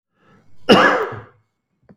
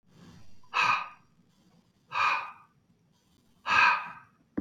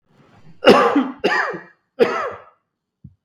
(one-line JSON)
{"cough_length": "2.0 s", "cough_amplitude": 32768, "cough_signal_mean_std_ratio": 0.38, "exhalation_length": "4.6 s", "exhalation_amplitude": 11357, "exhalation_signal_mean_std_ratio": 0.41, "three_cough_length": "3.2 s", "three_cough_amplitude": 32768, "three_cough_signal_mean_std_ratio": 0.43, "survey_phase": "beta (2021-08-13 to 2022-03-07)", "age": "45-64", "gender": "Male", "wearing_mask": "No", "symptom_cough_any": true, "smoker_status": "Never smoked", "respiratory_condition_asthma": false, "respiratory_condition_other": false, "recruitment_source": "REACT", "submission_delay": "1 day", "covid_test_result": "Negative", "covid_test_method": "RT-qPCR", "influenza_a_test_result": "Unknown/Void", "influenza_b_test_result": "Unknown/Void"}